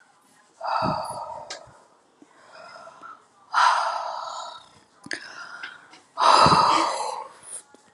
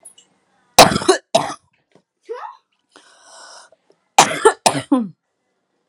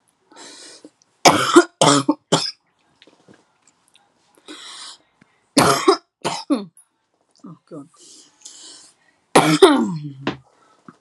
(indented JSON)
{
  "exhalation_length": "7.9 s",
  "exhalation_amplitude": 25189,
  "exhalation_signal_mean_std_ratio": 0.45,
  "cough_length": "5.9 s",
  "cough_amplitude": 32768,
  "cough_signal_mean_std_ratio": 0.29,
  "three_cough_length": "11.0 s",
  "three_cough_amplitude": 32768,
  "three_cough_signal_mean_std_ratio": 0.33,
  "survey_phase": "alpha (2021-03-01 to 2021-08-12)",
  "age": "18-44",
  "gender": "Female",
  "wearing_mask": "No",
  "symptom_cough_any": true,
  "smoker_status": "Never smoked",
  "respiratory_condition_asthma": false,
  "respiratory_condition_other": false,
  "recruitment_source": "REACT",
  "submission_delay": "4 days",
  "covid_test_result": "Negative",
  "covid_test_method": "RT-qPCR"
}